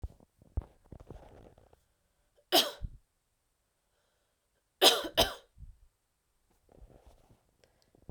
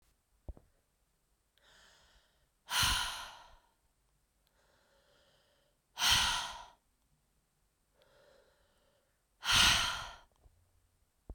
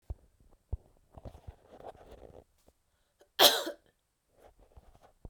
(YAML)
three_cough_length: 8.1 s
three_cough_amplitude: 14456
three_cough_signal_mean_std_ratio: 0.22
exhalation_length: 11.3 s
exhalation_amplitude: 6895
exhalation_signal_mean_std_ratio: 0.3
cough_length: 5.3 s
cough_amplitude: 17452
cough_signal_mean_std_ratio: 0.2
survey_phase: beta (2021-08-13 to 2022-03-07)
age: 45-64
gender: Female
wearing_mask: 'No'
symptom_runny_or_blocked_nose: true
symptom_fatigue: true
symptom_other: true
smoker_status: Never smoked
respiratory_condition_asthma: false
respiratory_condition_other: false
recruitment_source: Test and Trace
submission_delay: 1 day
covid_test_result: Positive
covid_test_method: RT-qPCR
covid_ct_value: 20.7
covid_ct_gene: ORF1ab gene